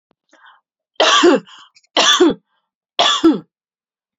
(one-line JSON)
{"three_cough_length": "4.2 s", "three_cough_amplitude": 30196, "three_cough_signal_mean_std_ratio": 0.44, "survey_phase": "beta (2021-08-13 to 2022-03-07)", "age": "18-44", "gender": "Female", "wearing_mask": "No", "symptom_none": true, "smoker_status": "Never smoked", "respiratory_condition_asthma": false, "respiratory_condition_other": false, "recruitment_source": "REACT", "submission_delay": "6 days", "covid_test_result": "Negative", "covid_test_method": "RT-qPCR"}